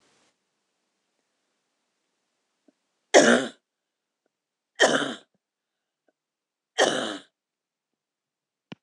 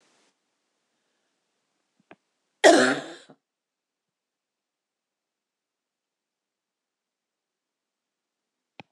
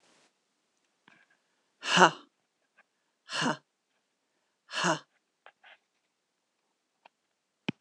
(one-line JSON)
{"three_cough_length": "8.8 s", "three_cough_amplitude": 24595, "three_cough_signal_mean_std_ratio": 0.23, "cough_length": "8.9 s", "cough_amplitude": 24984, "cough_signal_mean_std_ratio": 0.15, "exhalation_length": "7.8 s", "exhalation_amplitude": 20443, "exhalation_signal_mean_std_ratio": 0.2, "survey_phase": "beta (2021-08-13 to 2022-03-07)", "age": "45-64", "gender": "Female", "wearing_mask": "No", "symptom_cough_any": true, "symptom_sore_throat": true, "symptom_headache": true, "smoker_status": "Never smoked", "respiratory_condition_asthma": false, "respiratory_condition_other": true, "recruitment_source": "Test and Trace", "submission_delay": "3 days", "covid_test_result": "Positive", "covid_test_method": "ePCR"}